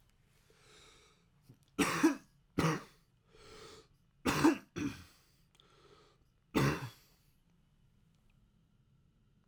three_cough_length: 9.5 s
three_cough_amplitude: 6224
three_cough_signal_mean_std_ratio: 0.31
survey_phase: beta (2021-08-13 to 2022-03-07)
age: 18-44
gender: Male
wearing_mask: 'No'
symptom_cough_any: true
symptom_runny_or_blocked_nose: true
symptom_sore_throat: true
symptom_fatigue: true
symptom_headache: true
smoker_status: Never smoked
respiratory_condition_asthma: false
respiratory_condition_other: false
recruitment_source: Test and Trace
submission_delay: 0 days
covid_test_result: Positive
covid_test_method: LFT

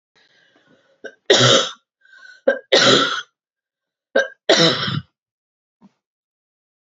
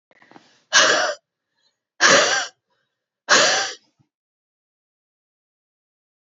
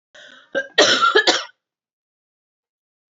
three_cough_length: 6.9 s
three_cough_amplitude: 29828
three_cough_signal_mean_std_ratio: 0.37
exhalation_length: 6.3 s
exhalation_amplitude: 32266
exhalation_signal_mean_std_ratio: 0.35
cough_length: 3.2 s
cough_amplitude: 29491
cough_signal_mean_std_ratio: 0.37
survey_phase: beta (2021-08-13 to 2022-03-07)
age: 18-44
gender: Female
wearing_mask: 'No'
symptom_sore_throat: true
symptom_fatigue: true
symptom_headache: true
symptom_onset: 2 days
smoker_status: Ex-smoker
respiratory_condition_asthma: false
respiratory_condition_other: false
recruitment_source: Test and Trace
submission_delay: 2 days
covid_test_result: Positive
covid_test_method: RT-qPCR
covid_ct_value: 27.6
covid_ct_gene: ORF1ab gene
covid_ct_mean: 28.0
covid_viral_load: 650 copies/ml
covid_viral_load_category: Minimal viral load (< 10K copies/ml)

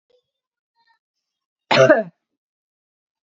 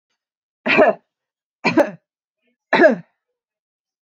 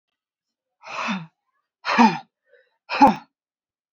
cough_length: 3.2 s
cough_amplitude: 31504
cough_signal_mean_std_ratio: 0.24
three_cough_length: 4.1 s
three_cough_amplitude: 27545
three_cough_signal_mean_std_ratio: 0.33
exhalation_length: 3.9 s
exhalation_amplitude: 27516
exhalation_signal_mean_std_ratio: 0.3
survey_phase: beta (2021-08-13 to 2022-03-07)
age: 18-44
gender: Female
wearing_mask: 'Yes'
symptom_runny_or_blocked_nose: true
symptom_sore_throat: true
symptom_fatigue: true
symptom_headache: true
symptom_change_to_sense_of_smell_or_taste: true
symptom_loss_of_taste: true
symptom_onset: 2 days
smoker_status: Never smoked
respiratory_condition_asthma: false
respiratory_condition_other: false
recruitment_source: Test and Trace
submission_delay: 2 days
covid_test_result: Positive
covid_test_method: RT-qPCR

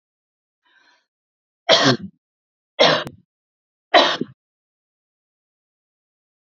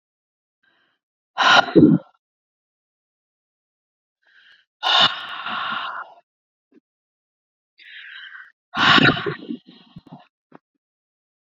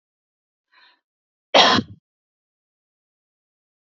three_cough_length: 6.6 s
three_cough_amplitude: 32768
three_cough_signal_mean_std_ratio: 0.26
exhalation_length: 11.4 s
exhalation_amplitude: 30122
exhalation_signal_mean_std_ratio: 0.3
cough_length: 3.8 s
cough_amplitude: 28876
cough_signal_mean_std_ratio: 0.21
survey_phase: beta (2021-08-13 to 2022-03-07)
age: 18-44
gender: Female
wearing_mask: 'No'
symptom_cough_any: true
symptom_runny_or_blocked_nose: true
symptom_fatigue: true
symptom_onset: 12 days
smoker_status: Ex-smoker
respiratory_condition_asthma: false
respiratory_condition_other: false
recruitment_source: REACT
submission_delay: 2 days
covid_test_result: Negative
covid_test_method: RT-qPCR
covid_ct_value: 38.0
covid_ct_gene: N gene
influenza_a_test_result: Negative
influenza_b_test_result: Negative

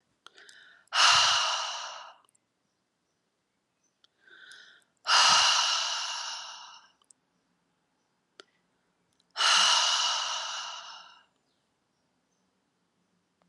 exhalation_length: 13.5 s
exhalation_amplitude: 12077
exhalation_signal_mean_std_ratio: 0.4
survey_phase: alpha (2021-03-01 to 2021-08-12)
age: 18-44
gender: Female
wearing_mask: 'No'
symptom_cough_any: true
symptom_fatigue: true
symptom_headache: true
smoker_status: Never smoked
respiratory_condition_asthma: false
respiratory_condition_other: false
recruitment_source: Test and Trace
submission_delay: 2 days
covid_test_result: Positive
covid_test_method: RT-qPCR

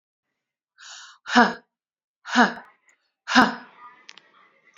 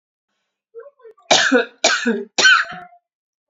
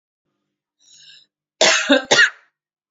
exhalation_length: 4.8 s
exhalation_amplitude: 27560
exhalation_signal_mean_std_ratio: 0.27
three_cough_length: 3.5 s
three_cough_amplitude: 31115
three_cough_signal_mean_std_ratio: 0.43
cough_length: 2.9 s
cough_amplitude: 29930
cough_signal_mean_std_ratio: 0.36
survey_phase: beta (2021-08-13 to 2022-03-07)
age: 45-64
gender: Female
wearing_mask: 'No'
symptom_cough_any: true
symptom_runny_or_blocked_nose: true
symptom_sore_throat: true
symptom_fatigue: true
symptom_headache: true
symptom_other: true
symptom_onset: 4 days
smoker_status: Never smoked
respiratory_condition_asthma: false
respiratory_condition_other: false
recruitment_source: Test and Trace
submission_delay: 2 days
covid_test_result: Positive
covid_test_method: RT-qPCR
covid_ct_value: 28.0
covid_ct_gene: N gene
covid_ct_mean: 28.1
covid_viral_load: 600 copies/ml
covid_viral_load_category: Minimal viral load (< 10K copies/ml)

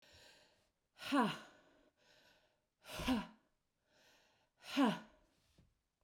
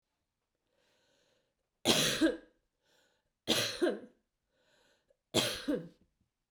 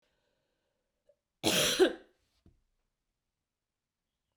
exhalation_length: 6.0 s
exhalation_amplitude: 2694
exhalation_signal_mean_std_ratio: 0.32
three_cough_length: 6.5 s
three_cough_amplitude: 8209
three_cough_signal_mean_std_ratio: 0.36
cough_length: 4.4 s
cough_amplitude: 7415
cough_signal_mean_std_ratio: 0.26
survey_phase: beta (2021-08-13 to 2022-03-07)
age: 45-64
gender: Female
wearing_mask: 'No'
symptom_none: true
smoker_status: Ex-smoker
respiratory_condition_asthma: false
respiratory_condition_other: false
recruitment_source: REACT
submission_delay: 0 days
covid_test_method: RT-qPCR
influenza_a_test_result: Unknown/Void
influenza_b_test_result: Unknown/Void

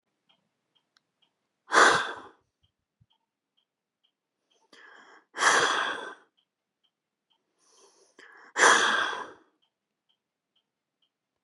exhalation_length: 11.4 s
exhalation_amplitude: 18613
exhalation_signal_mean_std_ratio: 0.28
survey_phase: beta (2021-08-13 to 2022-03-07)
age: 18-44
gender: Female
wearing_mask: 'No'
symptom_none: true
smoker_status: Never smoked
respiratory_condition_asthma: false
respiratory_condition_other: false
recruitment_source: REACT
submission_delay: 4 days
covid_test_result: Negative
covid_test_method: RT-qPCR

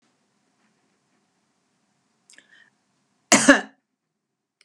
cough_length: 4.6 s
cough_amplitude: 32767
cough_signal_mean_std_ratio: 0.17
survey_phase: beta (2021-08-13 to 2022-03-07)
age: 65+
gender: Female
wearing_mask: 'No'
symptom_abdominal_pain: true
symptom_fatigue: true
symptom_onset: 12 days
smoker_status: Never smoked
respiratory_condition_asthma: false
respiratory_condition_other: false
recruitment_source: REACT
submission_delay: 1 day
covid_test_result: Negative
covid_test_method: RT-qPCR
influenza_a_test_result: Negative
influenza_b_test_result: Negative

